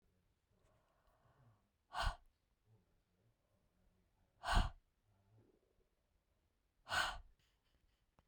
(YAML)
exhalation_length: 8.3 s
exhalation_amplitude: 2560
exhalation_signal_mean_std_ratio: 0.24
survey_phase: beta (2021-08-13 to 2022-03-07)
age: 18-44
gender: Female
wearing_mask: 'No'
symptom_cough_any: true
symptom_runny_or_blocked_nose: true
symptom_fatigue: true
symptom_other: true
symptom_onset: 4 days
smoker_status: Never smoked
respiratory_condition_asthma: false
respiratory_condition_other: false
recruitment_source: Test and Trace
submission_delay: 1 day
covid_test_result: Positive
covid_test_method: RT-qPCR